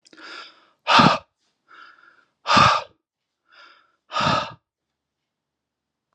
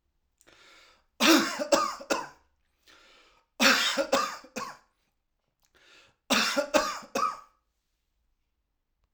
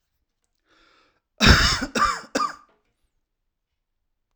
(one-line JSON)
{"exhalation_length": "6.1 s", "exhalation_amplitude": 30046, "exhalation_signal_mean_std_ratio": 0.31, "three_cough_length": "9.1 s", "three_cough_amplitude": 17826, "three_cough_signal_mean_std_ratio": 0.39, "cough_length": "4.4 s", "cough_amplitude": 32768, "cough_signal_mean_std_ratio": 0.32, "survey_phase": "alpha (2021-03-01 to 2021-08-12)", "age": "45-64", "gender": "Male", "wearing_mask": "No", "symptom_none": true, "smoker_status": "Never smoked", "respiratory_condition_asthma": false, "respiratory_condition_other": false, "recruitment_source": "REACT", "submission_delay": "2 days", "covid_test_result": "Negative", "covid_test_method": "RT-qPCR"}